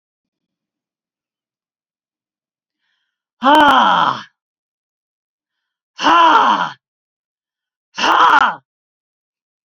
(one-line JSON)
{"exhalation_length": "9.6 s", "exhalation_amplitude": 32768, "exhalation_signal_mean_std_ratio": 0.37, "survey_phase": "beta (2021-08-13 to 2022-03-07)", "age": "65+", "gender": "Female", "wearing_mask": "No", "symptom_none": true, "symptom_onset": "6 days", "smoker_status": "Ex-smoker", "respiratory_condition_asthma": false, "respiratory_condition_other": false, "recruitment_source": "REACT", "submission_delay": "2 days", "covid_test_result": "Negative", "covid_test_method": "RT-qPCR", "influenza_a_test_result": "Negative", "influenza_b_test_result": "Negative"}